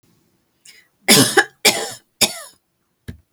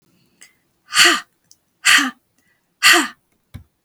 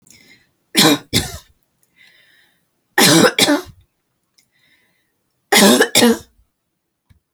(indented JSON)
{
  "cough_length": "3.3 s",
  "cough_amplitude": 32768,
  "cough_signal_mean_std_ratio": 0.33,
  "exhalation_length": "3.8 s",
  "exhalation_amplitude": 32768,
  "exhalation_signal_mean_std_ratio": 0.35,
  "three_cough_length": "7.3 s",
  "three_cough_amplitude": 32768,
  "three_cough_signal_mean_std_ratio": 0.37,
  "survey_phase": "beta (2021-08-13 to 2022-03-07)",
  "age": "45-64",
  "gender": "Female",
  "wearing_mask": "No",
  "symptom_none": true,
  "smoker_status": "Never smoked",
  "respiratory_condition_asthma": false,
  "respiratory_condition_other": false,
  "recruitment_source": "Test and Trace",
  "submission_delay": "1 day",
  "covid_test_result": "Negative",
  "covid_test_method": "LAMP"
}